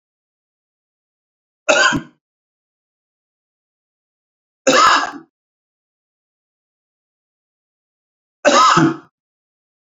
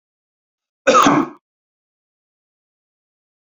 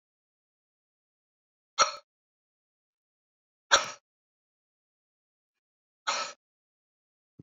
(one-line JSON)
{"three_cough_length": "9.9 s", "three_cough_amplitude": 32189, "three_cough_signal_mean_std_ratio": 0.28, "cough_length": "3.5 s", "cough_amplitude": 30564, "cough_signal_mean_std_ratio": 0.27, "exhalation_length": "7.4 s", "exhalation_amplitude": 21010, "exhalation_signal_mean_std_ratio": 0.17, "survey_phase": "beta (2021-08-13 to 2022-03-07)", "age": "45-64", "gender": "Male", "wearing_mask": "No", "symptom_none": true, "smoker_status": "Never smoked", "respiratory_condition_asthma": false, "respiratory_condition_other": false, "recruitment_source": "REACT", "submission_delay": "4 days", "covid_test_result": "Negative", "covid_test_method": "RT-qPCR", "influenza_a_test_result": "Negative", "influenza_b_test_result": "Negative"}